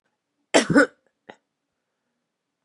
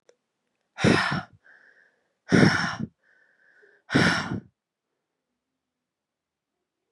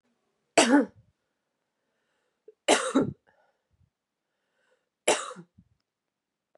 {"cough_length": "2.6 s", "cough_amplitude": 29870, "cough_signal_mean_std_ratio": 0.24, "exhalation_length": "6.9 s", "exhalation_amplitude": 23574, "exhalation_signal_mean_std_ratio": 0.33, "three_cough_length": "6.6 s", "three_cough_amplitude": 18938, "three_cough_signal_mean_std_ratio": 0.26, "survey_phase": "beta (2021-08-13 to 2022-03-07)", "age": "18-44", "gender": "Female", "wearing_mask": "No", "symptom_cough_any": true, "symptom_runny_or_blocked_nose": true, "symptom_shortness_of_breath": true, "symptom_fatigue": true, "symptom_fever_high_temperature": true, "symptom_other": true, "symptom_onset": "3 days", "smoker_status": "Current smoker (e-cigarettes or vapes only)", "respiratory_condition_asthma": false, "respiratory_condition_other": false, "recruitment_source": "Test and Trace", "submission_delay": "2 days", "covid_test_result": "Positive", "covid_test_method": "ePCR"}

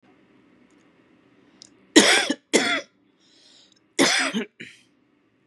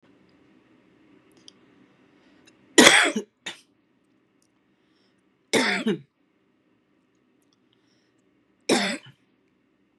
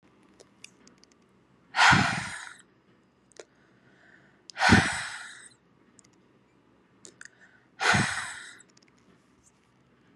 {"cough_length": "5.5 s", "cough_amplitude": 32743, "cough_signal_mean_std_ratio": 0.33, "three_cough_length": "10.0 s", "three_cough_amplitude": 32768, "three_cough_signal_mean_std_ratio": 0.24, "exhalation_length": "10.2 s", "exhalation_amplitude": 19212, "exhalation_signal_mean_std_ratio": 0.3, "survey_phase": "beta (2021-08-13 to 2022-03-07)", "age": "18-44", "gender": "Female", "wearing_mask": "No", "symptom_cough_any": true, "symptom_runny_or_blocked_nose": true, "symptom_fatigue": true, "symptom_headache": true, "symptom_change_to_sense_of_smell_or_taste": true, "symptom_onset": "6 days", "smoker_status": "Current smoker (1 to 10 cigarettes per day)", "respiratory_condition_asthma": true, "respiratory_condition_other": false, "recruitment_source": "Test and Trace", "submission_delay": "2 days", "covid_test_result": "Positive", "covid_test_method": "RT-qPCR", "covid_ct_value": 19.9, "covid_ct_gene": "ORF1ab gene", "covid_ct_mean": 20.4, "covid_viral_load": "200000 copies/ml", "covid_viral_load_category": "Low viral load (10K-1M copies/ml)"}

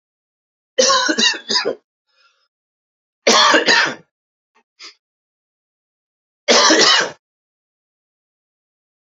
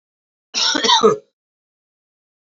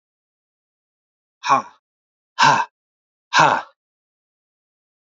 {"three_cough_length": "9.0 s", "three_cough_amplitude": 32479, "three_cough_signal_mean_std_ratio": 0.38, "cough_length": "2.5 s", "cough_amplitude": 27949, "cough_signal_mean_std_ratio": 0.38, "exhalation_length": "5.1 s", "exhalation_amplitude": 28650, "exhalation_signal_mean_std_ratio": 0.28, "survey_phase": "beta (2021-08-13 to 2022-03-07)", "age": "45-64", "gender": "Male", "wearing_mask": "No", "symptom_cough_any": true, "symptom_runny_or_blocked_nose": true, "symptom_fatigue": true, "symptom_headache": true, "symptom_onset": "4 days", "smoker_status": "Ex-smoker", "respiratory_condition_asthma": false, "respiratory_condition_other": false, "recruitment_source": "Test and Trace", "submission_delay": "2 days", "covid_test_result": "Positive", "covid_test_method": "RT-qPCR"}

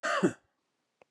{"cough_length": "1.1 s", "cough_amplitude": 7209, "cough_signal_mean_std_ratio": 0.39, "survey_phase": "beta (2021-08-13 to 2022-03-07)", "age": "45-64", "gender": "Male", "wearing_mask": "No", "symptom_none": true, "smoker_status": "Ex-smoker", "respiratory_condition_asthma": false, "respiratory_condition_other": false, "recruitment_source": "REACT", "submission_delay": "5 days", "covid_test_result": "Negative", "covid_test_method": "RT-qPCR", "influenza_a_test_result": "Negative", "influenza_b_test_result": "Negative"}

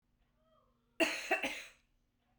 {"cough_length": "2.4 s", "cough_amplitude": 4416, "cough_signal_mean_std_ratio": 0.35, "survey_phase": "beta (2021-08-13 to 2022-03-07)", "age": "45-64", "gender": "Female", "wearing_mask": "No", "symptom_runny_or_blocked_nose": true, "symptom_sore_throat": true, "symptom_fatigue": true, "symptom_headache": true, "smoker_status": "Never smoked", "respiratory_condition_asthma": false, "respiratory_condition_other": false, "recruitment_source": "REACT", "submission_delay": "1 day", "covid_test_result": "Negative", "covid_test_method": "RT-qPCR"}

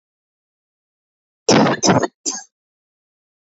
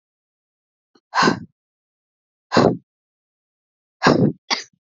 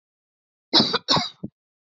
{"three_cough_length": "3.4 s", "three_cough_amplitude": 28733, "three_cough_signal_mean_std_ratio": 0.33, "exhalation_length": "4.9 s", "exhalation_amplitude": 28778, "exhalation_signal_mean_std_ratio": 0.31, "cough_length": "2.0 s", "cough_amplitude": 24655, "cough_signal_mean_std_ratio": 0.35, "survey_phase": "beta (2021-08-13 to 2022-03-07)", "age": "45-64", "gender": "Female", "wearing_mask": "No", "symptom_cough_any": true, "symptom_new_continuous_cough": true, "symptom_runny_or_blocked_nose": true, "symptom_shortness_of_breath": true, "symptom_sore_throat": true, "symptom_abdominal_pain": true, "symptom_diarrhoea": true, "symptom_fatigue": true, "symptom_fever_high_temperature": true, "symptom_headache": true, "symptom_change_to_sense_of_smell_or_taste": true, "symptom_loss_of_taste": true, "symptom_other": true, "symptom_onset": "3 days", "smoker_status": "Never smoked", "respiratory_condition_asthma": true, "respiratory_condition_other": false, "recruitment_source": "Test and Trace", "submission_delay": "2 days", "covid_test_result": "Positive", "covid_test_method": "RT-qPCR", "covid_ct_value": 14.8, "covid_ct_gene": "ORF1ab gene", "covid_ct_mean": 15.2, "covid_viral_load": "10000000 copies/ml", "covid_viral_load_category": "High viral load (>1M copies/ml)"}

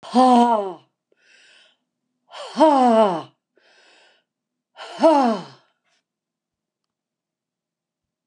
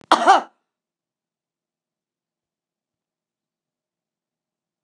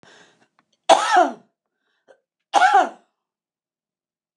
{"exhalation_length": "8.3 s", "exhalation_amplitude": 25545, "exhalation_signal_mean_std_ratio": 0.36, "cough_length": "4.8 s", "cough_amplitude": 29204, "cough_signal_mean_std_ratio": 0.18, "three_cough_length": "4.4 s", "three_cough_amplitude": 29204, "three_cough_signal_mean_std_ratio": 0.32, "survey_phase": "beta (2021-08-13 to 2022-03-07)", "age": "65+", "gender": "Female", "wearing_mask": "No", "symptom_runny_or_blocked_nose": true, "symptom_onset": "12 days", "smoker_status": "Never smoked", "respiratory_condition_asthma": false, "respiratory_condition_other": false, "recruitment_source": "REACT", "submission_delay": "2 days", "covid_test_result": "Positive", "covid_test_method": "RT-qPCR", "covid_ct_value": 33.4, "covid_ct_gene": "N gene", "influenza_a_test_result": "Negative", "influenza_b_test_result": "Negative"}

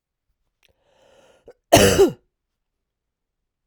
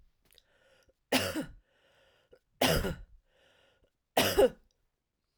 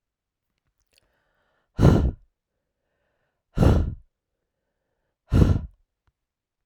{"cough_length": "3.7 s", "cough_amplitude": 32768, "cough_signal_mean_std_ratio": 0.25, "three_cough_length": "5.4 s", "three_cough_amplitude": 8997, "three_cough_signal_mean_std_ratio": 0.32, "exhalation_length": "6.7 s", "exhalation_amplitude": 25974, "exhalation_signal_mean_std_ratio": 0.29, "survey_phase": "beta (2021-08-13 to 2022-03-07)", "age": "45-64", "gender": "Female", "wearing_mask": "No", "symptom_cough_any": true, "symptom_runny_or_blocked_nose": true, "symptom_shortness_of_breath": true, "symptom_fatigue": true, "symptom_change_to_sense_of_smell_or_taste": true, "symptom_onset": "6 days", "smoker_status": "Never smoked", "respiratory_condition_asthma": false, "respiratory_condition_other": false, "recruitment_source": "Test and Trace", "submission_delay": "3 days", "covid_test_result": "Positive", "covid_test_method": "RT-qPCR"}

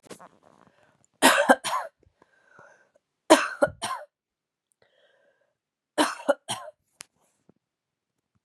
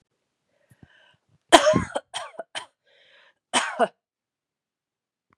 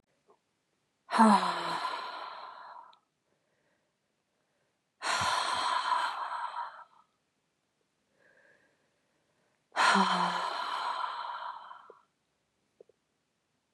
{"three_cough_length": "8.4 s", "three_cough_amplitude": 29603, "three_cough_signal_mean_std_ratio": 0.25, "cough_length": "5.4 s", "cough_amplitude": 32768, "cough_signal_mean_std_ratio": 0.24, "exhalation_length": "13.7 s", "exhalation_amplitude": 10927, "exhalation_signal_mean_std_ratio": 0.42, "survey_phase": "beta (2021-08-13 to 2022-03-07)", "age": "18-44", "gender": "Female", "wearing_mask": "No", "symptom_sore_throat": true, "symptom_fatigue": true, "symptom_headache": true, "symptom_onset": "3 days", "smoker_status": "Ex-smoker", "respiratory_condition_asthma": false, "respiratory_condition_other": false, "recruitment_source": "REACT", "submission_delay": "2 days", "covid_test_result": "Positive", "covid_test_method": "RT-qPCR", "covid_ct_value": 21.0, "covid_ct_gene": "E gene", "influenza_a_test_result": "Negative", "influenza_b_test_result": "Negative"}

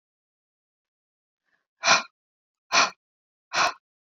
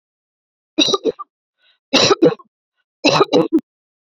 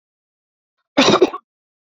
{"exhalation_length": "4.1 s", "exhalation_amplitude": 17498, "exhalation_signal_mean_std_ratio": 0.27, "three_cough_length": "4.0 s", "three_cough_amplitude": 32768, "three_cough_signal_mean_std_ratio": 0.4, "cough_length": "1.9 s", "cough_amplitude": 29133, "cough_signal_mean_std_ratio": 0.32, "survey_phase": "beta (2021-08-13 to 2022-03-07)", "age": "18-44", "gender": "Female", "wearing_mask": "No", "symptom_none": true, "smoker_status": "Never smoked", "respiratory_condition_asthma": false, "respiratory_condition_other": false, "recruitment_source": "REACT", "submission_delay": "1 day", "covid_test_result": "Negative", "covid_test_method": "RT-qPCR", "influenza_a_test_result": "Negative", "influenza_b_test_result": "Negative"}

